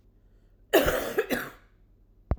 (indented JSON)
{
  "cough_length": "2.4 s",
  "cough_amplitude": 15202,
  "cough_signal_mean_std_ratio": 0.41,
  "survey_phase": "alpha (2021-03-01 to 2021-08-12)",
  "age": "45-64",
  "gender": "Female",
  "wearing_mask": "No",
  "symptom_cough_any": true,
  "symptom_headache": true,
  "symptom_onset": "4 days",
  "smoker_status": "Ex-smoker",
  "respiratory_condition_asthma": false,
  "respiratory_condition_other": false,
  "recruitment_source": "Test and Trace",
  "submission_delay": "2 days",
  "covid_test_result": "Positive",
  "covid_test_method": "RT-qPCR",
  "covid_ct_value": 28.6,
  "covid_ct_gene": "N gene"
}